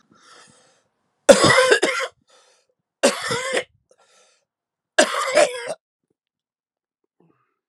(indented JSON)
{
  "three_cough_length": "7.7 s",
  "three_cough_amplitude": 32768,
  "three_cough_signal_mean_std_ratio": 0.34,
  "survey_phase": "alpha (2021-03-01 to 2021-08-12)",
  "age": "45-64",
  "gender": "Male",
  "wearing_mask": "No",
  "symptom_cough_any": true,
  "symptom_fatigue": true,
  "symptom_headache": true,
  "smoker_status": "Never smoked",
  "respiratory_condition_asthma": false,
  "respiratory_condition_other": false,
  "recruitment_source": "Test and Trace",
  "submission_delay": "2 days",
  "covid_test_result": "Positive",
  "covid_test_method": "LFT"
}